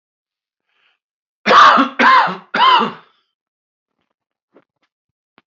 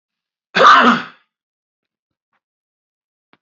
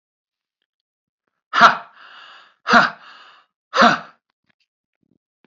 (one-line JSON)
{"three_cough_length": "5.5 s", "three_cough_amplitude": 29142, "three_cough_signal_mean_std_ratio": 0.37, "cough_length": "3.4 s", "cough_amplitude": 28729, "cough_signal_mean_std_ratio": 0.3, "exhalation_length": "5.5 s", "exhalation_amplitude": 28740, "exhalation_signal_mean_std_ratio": 0.27, "survey_phase": "alpha (2021-03-01 to 2021-08-12)", "age": "45-64", "gender": "Male", "wearing_mask": "No", "symptom_none": true, "smoker_status": "Never smoked", "respiratory_condition_asthma": false, "respiratory_condition_other": false, "recruitment_source": "REACT", "submission_delay": "1 day", "covid_test_result": "Negative", "covid_test_method": "RT-qPCR"}